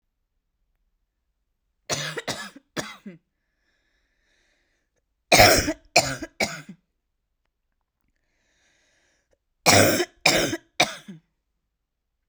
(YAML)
three_cough_length: 12.3 s
three_cough_amplitude: 32767
three_cough_signal_mean_std_ratio: 0.28
survey_phase: beta (2021-08-13 to 2022-03-07)
age: 18-44
gender: Female
wearing_mask: 'No'
symptom_cough_any: true
symptom_new_continuous_cough: true
symptom_runny_or_blocked_nose: true
symptom_sore_throat: true
symptom_abdominal_pain: true
symptom_fatigue: true
symptom_onset: 5 days
smoker_status: Ex-smoker
respiratory_condition_asthma: false
respiratory_condition_other: false
recruitment_source: Test and Trace
submission_delay: 2 days
covid_test_result: Positive
covid_test_method: RT-qPCR
covid_ct_value: 28.6
covid_ct_gene: ORF1ab gene
covid_ct_mean: 29.1
covid_viral_load: 290 copies/ml
covid_viral_load_category: Minimal viral load (< 10K copies/ml)